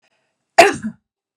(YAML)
cough_length: 1.4 s
cough_amplitude: 32768
cough_signal_mean_std_ratio: 0.27
survey_phase: beta (2021-08-13 to 2022-03-07)
age: 18-44
gender: Female
wearing_mask: 'No'
symptom_none: true
smoker_status: Ex-smoker
respiratory_condition_asthma: false
respiratory_condition_other: false
recruitment_source: Test and Trace
submission_delay: 0 days
covid_test_result: Negative
covid_test_method: LFT